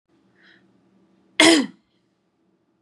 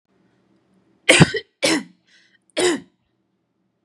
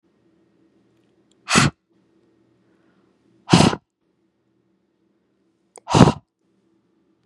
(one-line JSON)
{"cough_length": "2.8 s", "cough_amplitude": 32361, "cough_signal_mean_std_ratio": 0.24, "three_cough_length": "3.8 s", "three_cough_amplitude": 32768, "three_cough_signal_mean_std_ratio": 0.3, "exhalation_length": "7.3 s", "exhalation_amplitude": 32768, "exhalation_signal_mean_std_ratio": 0.22, "survey_phase": "beta (2021-08-13 to 2022-03-07)", "age": "18-44", "gender": "Female", "wearing_mask": "No", "symptom_none": true, "smoker_status": "Never smoked", "respiratory_condition_asthma": false, "respiratory_condition_other": false, "recruitment_source": "REACT", "submission_delay": "0 days", "covid_test_result": "Negative", "covid_test_method": "RT-qPCR", "influenza_a_test_result": "Negative", "influenza_b_test_result": "Negative"}